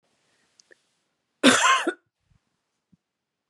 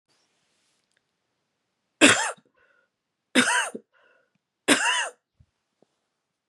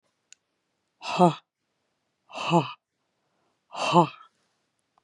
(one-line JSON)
{"cough_length": "3.5 s", "cough_amplitude": 28128, "cough_signal_mean_std_ratio": 0.27, "three_cough_length": "6.5 s", "three_cough_amplitude": 31760, "three_cough_signal_mean_std_ratio": 0.28, "exhalation_length": "5.0 s", "exhalation_amplitude": 20583, "exhalation_signal_mean_std_ratio": 0.27, "survey_phase": "beta (2021-08-13 to 2022-03-07)", "age": "45-64", "gender": "Female", "wearing_mask": "No", "symptom_cough_any": true, "symptom_runny_or_blocked_nose": true, "symptom_sore_throat": true, "symptom_fatigue": true, "symptom_onset": "7 days", "smoker_status": "Ex-smoker", "respiratory_condition_asthma": false, "respiratory_condition_other": false, "recruitment_source": "REACT", "submission_delay": "1 day", "covid_test_result": "Negative", "covid_test_method": "RT-qPCR"}